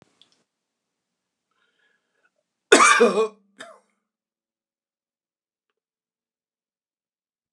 {"cough_length": "7.5 s", "cough_amplitude": 29204, "cough_signal_mean_std_ratio": 0.21, "survey_phase": "alpha (2021-03-01 to 2021-08-12)", "age": "65+", "gender": "Male", "wearing_mask": "No", "symptom_none": true, "smoker_status": "Ex-smoker", "respiratory_condition_asthma": false, "respiratory_condition_other": false, "recruitment_source": "REACT", "submission_delay": "5 days", "covid_test_result": "Negative", "covid_test_method": "RT-qPCR"}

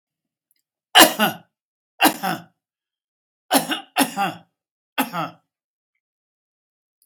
{"cough_length": "7.1 s", "cough_amplitude": 32768, "cough_signal_mean_std_ratio": 0.28, "survey_phase": "beta (2021-08-13 to 2022-03-07)", "age": "65+", "gender": "Male", "wearing_mask": "No", "symptom_none": true, "smoker_status": "Ex-smoker", "respiratory_condition_asthma": false, "respiratory_condition_other": false, "recruitment_source": "REACT", "submission_delay": "1 day", "covid_test_result": "Negative", "covid_test_method": "RT-qPCR"}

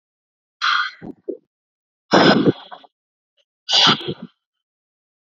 {"exhalation_length": "5.4 s", "exhalation_amplitude": 30255, "exhalation_signal_mean_std_ratio": 0.35, "survey_phase": "beta (2021-08-13 to 2022-03-07)", "age": "18-44", "gender": "Female", "wearing_mask": "No", "symptom_none": true, "smoker_status": "Ex-smoker", "respiratory_condition_asthma": false, "respiratory_condition_other": false, "recruitment_source": "REACT", "submission_delay": "0 days", "covid_test_result": "Negative", "covid_test_method": "RT-qPCR"}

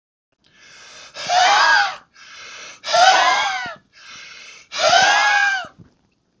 {"exhalation_length": "6.4 s", "exhalation_amplitude": 30610, "exhalation_signal_mean_std_ratio": 0.56, "survey_phase": "beta (2021-08-13 to 2022-03-07)", "age": "45-64", "gender": "Male", "wearing_mask": "No", "symptom_none": true, "smoker_status": "Ex-smoker", "respiratory_condition_asthma": false, "respiratory_condition_other": false, "recruitment_source": "REACT", "submission_delay": "1 day", "covid_test_result": "Negative", "covid_test_method": "RT-qPCR"}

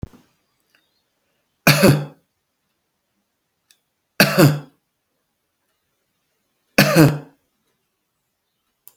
{"three_cough_length": "9.0 s", "three_cough_amplitude": 32768, "three_cough_signal_mean_std_ratio": 0.26, "survey_phase": "beta (2021-08-13 to 2022-03-07)", "age": "65+", "gender": "Male", "wearing_mask": "No", "symptom_none": true, "smoker_status": "Never smoked", "respiratory_condition_asthma": false, "respiratory_condition_other": false, "recruitment_source": "REACT", "submission_delay": "5 days", "covid_test_result": "Negative", "covid_test_method": "RT-qPCR", "influenza_a_test_result": "Negative", "influenza_b_test_result": "Negative"}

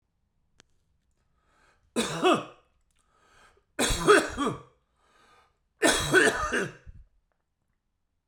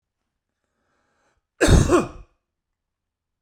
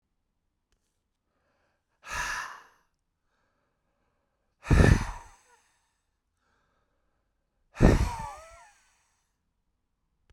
{"three_cough_length": "8.3 s", "three_cough_amplitude": 16270, "three_cough_signal_mean_std_ratio": 0.36, "cough_length": "3.4 s", "cough_amplitude": 23135, "cough_signal_mean_std_ratio": 0.28, "exhalation_length": "10.3 s", "exhalation_amplitude": 20880, "exhalation_signal_mean_std_ratio": 0.23, "survey_phase": "beta (2021-08-13 to 2022-03-07)", "age": "45-64", "gender": "Male", "wearing_mask": "No", "symptom_none": true, "smoker_status": "Never smoked", "respiratory_condition_asthma": false, "respiratory_condition_other": false, "recruitment_source": "REACT", "submission_delay": "0 days", "covid_test_result": "Negative", "covid_test_method": "RT-qPCR"}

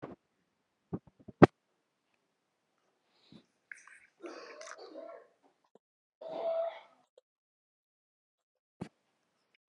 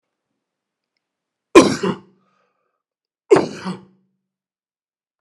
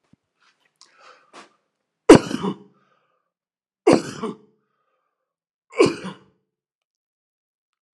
{"exhalation_length": "9.7 s", "exhalation_amplitude": 24471, "exhalation_signal_mean_std_ratio": 0.14, "cough_length": "5.2 s", "cough_amplitude": 32768, "cough_signal_mean_std_ratio": 0.22, "three_cough_length": "7.9 s", "three_cough_amplitude": 32768, "three_cough_signal_mean_std_ratio": 0.19, "survey_phase": "alpha (2021-03-01 to 2021-08-12)", "age": "45-64", "gender": "Male", "wearing_mask": "No", "symptom_cough_any": true, "symptom_fatigue": true, "symptom_onset": "9 days", "smoker_status": "Never smoked", "respiratory_condition_asthma": true, "respiratory_condition_other": false, "recruitment_source": "REACT", "submission_delay": "1 day", "covid_test_result": "Negative", "covid_test_method": "RT-qPCR"}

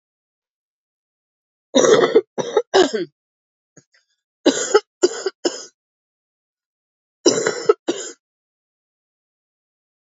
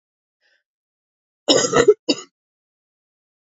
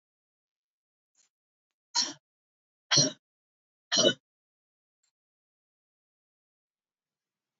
{"three_cough_length": "10.2 s", "three_cough_amplitude": 28897, "three_cough_signal_mean_std_ratio": 0.31, "cough_length": "3.5 s", "cough_amplitude": 29225, "cough_signal_mean_std_ratio": 0.27, "exhalation_length": "7.6 s", "exhalation_amplitude": 12836, "exhalation_signal_mean_std_ratio": 0.2, "survey_phase": "beta (2021-08-13 to 2022-03-07)", "age": "45-64", "gender": "Female", "wearing_mask": "No", "symptom_cough_any": true, "symptom_runny_or_blocked_nose": true, "symptom_shortness_of_breath": true, "symptom_sore_throat": true, "symptom_fatigue": true, "symptom_other": true, "symptom_onset": "2 days", "smoker_status": "Ex-smoker", "respiratory_condition_asthma": true, "respiratory_condition_other": false, "recruitment_source": "REACT", "submission_delay": "3 days", "covid_test_result": "Positive", "covid_test_method": "RT-qPCR", "covid_ct_value": 21.0, "covid_ct_gene": "E gene", "influenza_a_test_result": "Negative", "influenza_b_test_result": "Negative"}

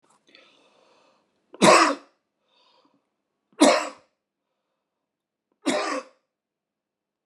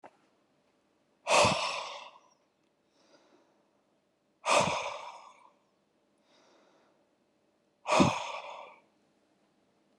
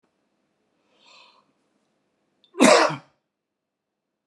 {"three_cough_length": "7.3 s", "three_cough_amplitude": 26808, "three_cough_signal_mean_std_ratio": 0.26, "exhalation_length": "10.0 s", "exhalation_amplitude": 9604, "exhalation_signal_mean_std_ratio": 0.31, "cough_length": "4.3 s", "cough_amplitude": 26378, "cough_signal_mean_std_ratio": 0.22, "survey_phase": "beta (2021-08-13 to 2022-03-07)", "age": "45-64", "gender": "Male", "wearing_mask": "No", "symptom_cough_any": true, "smoker_status": "Ex-smoker", "respiratory_condition_asthma": true, "respiratory_condition_other": false, "recruitment_source": "REACT", "submission_delay": "1 day", "covid_test_result": "Negative", "covid_test_method": "RT-qPCR"}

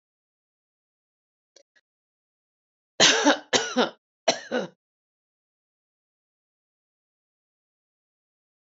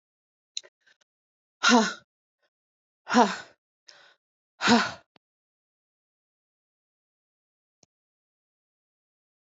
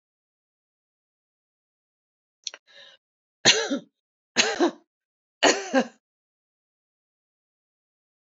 {"cough_length": "8.6 s", "cough_amplitude": 22829, "cough_signal_mean_std_ratio": 0.23, "exhalation_length": "9.5 s", "exhalation_amplitude": 18590, "exhalation_signal_mean_std_ratio": 0.21, "three_cough_length": "8.3 s", "three_cough_amplitude": 24275, "three_cough_signal_mean_std_ratio": 0.24, "survey_phase": "beta (2021-08-13 to 2022-03-07)", "age": "65+", "gender": "Female", "wearing_mask": "No", "symptom_none": true, "smoker_status": "Ex-smoker", "respiratory_condition_asthma": false, "respiratory_condition_other": false, "recruitment_source": "REACT", "submission_delay": "1 day", "covid_test_result": "Negative", "covid_test_method": "RT-qPCR"}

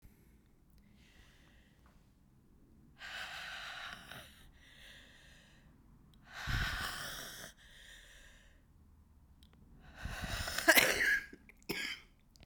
{"exhalation_length": "12.5 s", "exhalation_amplitude": 10112, "exhalation_signal_mean_std_ratio": 0.37, "survey_phase": "beta (2021-08-13 to 2022-03-07)", "age": "65+", "gender": "Female", "wearing_mask": "No", "symptom_new_continuous_cough": true, "symptom_runny_or_blocked_nose": true, "symptom_shortness_of_breath": true, "symptom_fatigue": true, "symptom_headache": true, "symptom_other": true, "symptom_onset": "3 days", "smoker_status": "Never smoked", "respiratory_condition_asthma": true, "respiratory_condition_other": false, "recruitment_source": "Test and Trace", "submission_delay": "2 days", "covid_test_result": "Positive", "covid_test_method": "ePCR"}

